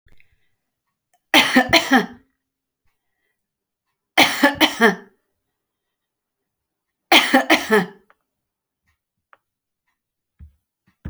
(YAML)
three_cough_length: 11.1 s
three_cough_amplitude: 32768
three_cough_signal_mean_std_ratio: 0.3
survey_phase: beta (2021-08-13 to 2022-03-07)
age: 45-64
gender: Female
wearing_mask: 'No'
symptom_none: true
smoker_status: Never smoked
respiratory_condition_asthma: false
respiratory_condition_other: false
recruitment_source: REACT
submission_delay: 0 days
covid_test_result: Negative
covid_test_method: RT-qPCR